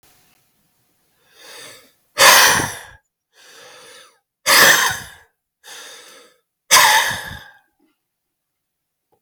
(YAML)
exhalation_length: 9.2 s
exhalation_amplitude: 32768
exhalation_signal_mean_std_ratio: 0.34
survey_phase: beta (2021-08-13 to 2022-03-07)
age: 65+
gender: Male
wearing_mask: 'No'
symptom_cough_any: true
smoker_status: Ex-smoker
respiratory_condition_asthma: false
respiratory_condition_other: false
recruitment_source: Test and Trace
submission_delay: 2 days
covid_test_result: Positive
covid_test_method: RT-qPCR
covid_ct_value: 23.9
covid_ct_gene: N gene